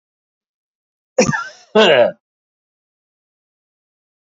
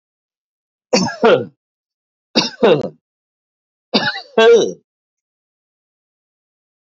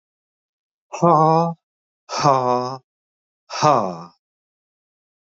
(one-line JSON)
{"cough_length": "4.4 s", "cough_amplitude": 28535, "cough_signal_mean_std_ratio": 0.29, "three_cough_length": "6.8 s", "three_cough_amplitude": 30105, "three_cough_signal_mean_std_ratio": 0.34, "exhalation_length": "5.4 s", "exhalation_amplitude": 28393, "exhalation_signal_mean_std_ratio": 0.38, "survey_phase": "beta (2021-08-13 to 2022-03-07)", "age": "45-64", "gender": "Male", "wearing_mask": "No", "symptom_none": true, "symptom_onset": "4 days", "smoker_status": "Ex-smoker", "respiratory_condition_asthma": false, "respiratory_condition_other": false, "recruitment_source": "Test and Trace", "submission_delay": "2 days", "covid_test_result": "Negative", "covid_test_method": "RT-qPCR"}